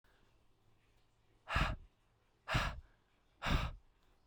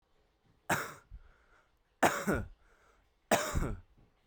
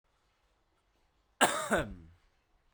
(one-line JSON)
{"exhalation_length": "4.3 s", "exhalation_amplitude": 3121, "exhalation_signal_mean_std_ratio": 0.38, "three_cough_length": "4.3 s", "three_cough_amplitude": 9177, "three_cough_signal_mean_std_ratio": 0.38, "cough_length": "2.7 s", "cough_amplitude": 11016, "cough_signal_mean_std_ratio": 0.3, "survey_phase": "beta (2021-08-13 to 2022-03-07)", "age": "18-44", "gender": "Male", "wearing_mask": "No", "symptom_none": true, "smoker_status": "Current smoker (1 to 10 cigarettes per day)", "respiratory_condition_asthma": false, "respiratory_condition_other": false, "recruitment_source": "Test and Trace", "submission_delay": "2 days", "covid_test_result": "Positive", "covid_test_method": "RT-qPCR", "covid_ct_value": 29.6, "covid_ct_gene": "ORF1ab gene"}